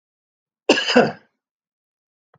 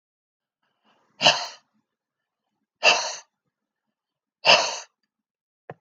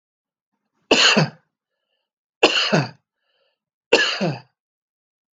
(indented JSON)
{
  "cough_length": "2.4 s",
  "cough_amplitude": 32767,
  "cough_signal_mean_std_ratio": 0.29,
  "exhalation_length": "5.8 s",
  "exhalation_amplitude": 25998,
  "exhalation_signal_mean_std_ratio": 0.26,
  "three_cough_length": "5.4 s",
  "three_cough_amplitude": 31024,
  "three_cough_signal_mean_std_ratio": 0.36,
  "survey_phase": "alpha (2021-03-01 to 2021-08-12)",
  "age": "45-64",
  "gender": "Male",
  "wearing_mask": "No",
  "symptom_none": true,
  "smoker_status": "Never smoked",
  "respiratory_condition_asthma": false,
  "respiratory_condition_other": false,
  "recruitment_source": "REACT",
  "submission_delay": "1 day",
  "covid_test_result": "Negative",
  "covid_test_method": "RT-qPCR"
}